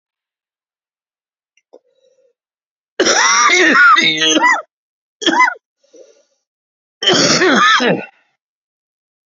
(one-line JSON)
{"cough_length": "9.3 s", "cough_amplitude": 32708, "cough_signal_mean_std_ratio": 0.48, "survey_phase": "beta (2021-08-13 to 2022-03-07)", "age": "45-64", "gender": "Male", "wearing_mask": "No", "symptom_cough_any": true, "symptom_new_continuous_cough": true, "symptom_runny_or_blocked_nose": true, "symptom_fatigue": true, "symptom_fever_high_temperature": true, "symptom_headache": true, "symptom_onset": "3 days", "smoker_status": "Never smoked", "respiratory_condition_asthma": false, "respiratory_condition_other": false, "recruitment_source": "Test and Trace", "submission_delay": "2 days", "covid_test_result": "Positive", "covid_test_method": "RT-qPCR", "covid_ct_value": 12.8, "covid_ct_gene": "ORF1ab gene", "covid_ct_mean": 13.2, "covid_viral_load": "47000000 copies/ml", "covid_viral_load_category": "High viral load (>1M copies/ml)"}